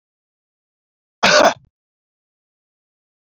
cough_length: 3.2 s
cough_amplitude: 29016
cough_signal_mean_std_ratio: 0.24
survey_phase: beta (2021-08-13 to 2022-03-07)
age: 18-44
gender: Male
wearing_mask: 'No'
symptom_none: true
smoker_status: Never smoked
respiratory_condition_asthma: false
respiratory_condition_other: false
recruitment_source: REACT
submission_delay: 2 days
covid_test_result: Negative
covid_test_method: RT-qPCR
influenza_a_test_result: Negative
influenza_b_test_result: Negative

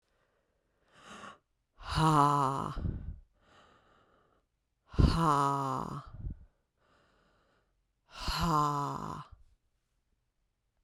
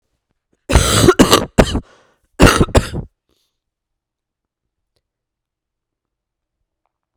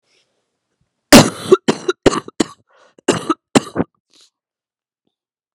exhalation_length: 10.8 s
exhalation_amplitude: 9729
exhalation_signal_mean_std_ratio: 0.42
three_cough_length: 7.2 s
three_cough_amplitude: 32768
three_cough_signal_mean_std_ratio: 0.31
cough_length: 5.5 s
cough_amplitude: 32768
cough_signal_mean_std_ratio: 0.26
survey_phase: beta (2021-08-13 to 2022-03-07)
age: 45-64
gender: Female
wearing_mask: 'No'
symptom_cough_any: true
symptom_runny_or_blocked_nose: true
symptom_shortness_of_breath: true
symptom_fatigue: true
symptom_headache: true
symptom_change_to_sense_of_smell_or_taste: true
smoker_status: Prefer not to say
respiratory_condition_asthma: false
respiratory_condition_other: false
recruitment_source: Test and Trace
submission_delay: 1 day
covid_test_result: Positive
covid_test_method: RT-qPCR
covid_ct_value: 13.5
covid_ct_gene: ORF1ab gene
covid_ct_mean: 15.4
covid_viral_load: 9000000 copies/ml
covid_viral_load_category: High viral load (>1M copies/ml)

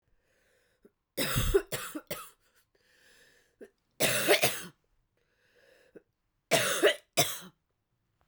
three_cough_length: 8.3 s
three_cough_amplitude: 10824
three_cough_signal_mean_std_ratio: 0.36
survey_phase: beta (2021-08-13 to 2022-03-07)
age: 45-64
gender: Female
wearing_mask: 'No'
symptom_cough_any: true
symptom_new_continuous_cough: true
symptom_runny_or_blocked_nose: true
symptom_shortness_of_breath: true
symptom_sore_throat: true
symptom_fatigue: true
symptom_fever_high_temperature: true
symptom_headache: true
symptom_change_to_sense_of_smell_or_taste: true
symptom_onset: 3 days
smoker_status: Ex-smoker
respiratory_condition_asthma: true
respiratory_condition_other: false
recruitment_source: Test and Trace
submission_delay: 2 days
covid_test_result: Positive
covid_test_method: RT-qPCR
covid_ct_value: 21.2
covid_ct_gene: ORF1ab gene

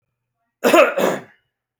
cough_length: 1.8 s
cough_amplitude: 32768
cough_signal_mean_std_ratio: 0.4
survey_phase: alpha (2021-03-01 to 2021-08-12)
age: 18-44
gender: Male
wearing_mask: 'No'
symptom_cough_any: true
smoker_status: Never smoked
respiratory_condition_asthma: false
respiratory_condition_other: false
recruitment_source: REACT
submission_delay: 1 day
covid_test_result: Negative
covid_test_method: RT-qPCR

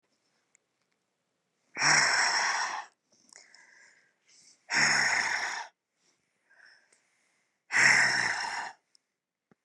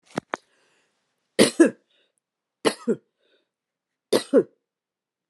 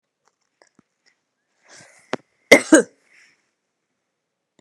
exhalation_length: 9.6 s
exhalation_amplitude: 11202
exhalation_signal_mean_std_ratio: 0.44
three_cough_length: 5.3 s
three_cough_amplitude: 29203
three_cough_signal_mean_std_ratio: 0.24
cough_length: 4.6 s
cough_amplitude: 32768
cough_signal_mean_std_ratio: 0.16
survey_phase: beta (2021-08-13 to 2022-03-07)
age: 45-64
gender: Female
wearing_mask: 'No'
symptom_cough_any: true
symptom_runny_or_blocked_nose: true
symptom_sore_throat: true
symptom_fatigue: true
symptom_headache: true
symptom_onset: 12 days
smoker_status: Never smoked
respiratory_condition_asthma: false
respiratory_condition_other: false
recruitment_source: REACT
submission_delay: 2 days
covid_test_result: Negative
covid_test_method: RT-qPCR
influenza_a_test_result: Negative
influenza_b_test_result: Negative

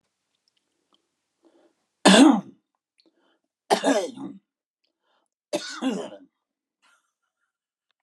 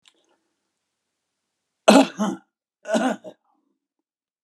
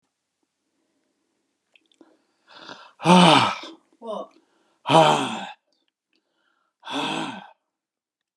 three_cough_length: 8.0 s
three_cough_amplitude: 25895
three_cough_signal_mean_std_ratio: 0.25
cough_length: 4.4 s
cough_amplitude: 32003
cough_signal_mean_std_ratio: 0.26
exhalation_length: 8.4 s
exhalation_amplitude: 32158
exhalation_signal_mean_std_ratio: 0.31
survey_phase: alpha (2021-03-01 to 2021-08-12)
age: 65+
gender: Male
wearing_mask: 'No'
symptom_none: true
smoker_status: Current smoker (11 or more cigarettes per day)
respiratory_condition_asthma: false
respiratory_condition_other: false
recruitment_source: REACT
submission_delay: 1 day
covid_test_result: Negative
covid_test_method: RT-qPCR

